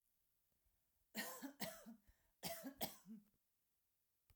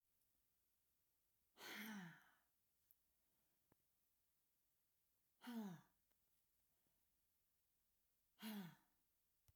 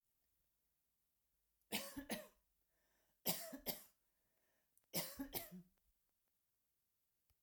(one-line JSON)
{"cough_length": "4.4 s", "cough_amplitude": 1075, "cough_signal_mean_std_ratio": 0.42, "exhalation_length": "9.6 s", "exhalation_amplitude": 254, "exhalation_signal_mean_std_ratio": 0.35, "three_cough_length": "7.4 s", "three_cough_amplitude": 1747, "three_cough_signal_mean_std_ratio": 0.32, "survey_phase": "alpha (2021-03-01 to 2021-08-12)", "age": "45-64", "gender": "Female", "wearing_mask": "No", "symptom_none": true, "smoker_status": "Ex-smoker", "respiratory_condition_asthma": false, "respiratory_condition_other": false, "recruitment_source": "REACT", "submission_delay": "1 day", "covid_test_result": "Negative", "covid_test_method": "RT-qPCR"}